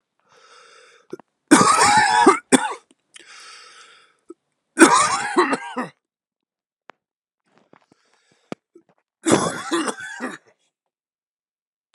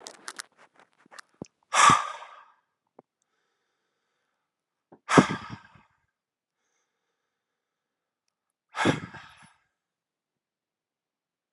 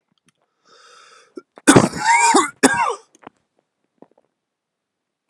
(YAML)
three_cough_length: 11.9 s
three_cough_amplitude: 32768
three_cough_signal_mean_std_ratio: 0.35
exhalation_length: 11.5 s
exhalation_amplitude: 30589
exhalation_signal_mean_std_ratio: 0.2
cough_length: 5.3 s
cough_amplitude: 32768
cough_signal_mean_std_ratio: 0.33
survey_phase: alpha (2021-03-01 to 2021-08-12)
age: 18-44
gender: Male
wearing_mask: 'No'
symptom_cough_any: true
symptom_new_continuous_cough: true
symptom_fever_high_temperature: true
symptom_onset: 14 days
smoker_status: Never smoked
respiratory_condition_asthma: false
respiratory_condition_other: false
recruitment_source: Test and Trace
submission_delay: 11 days
covid_test_result: Positive
covid_test_method: RT-qPCR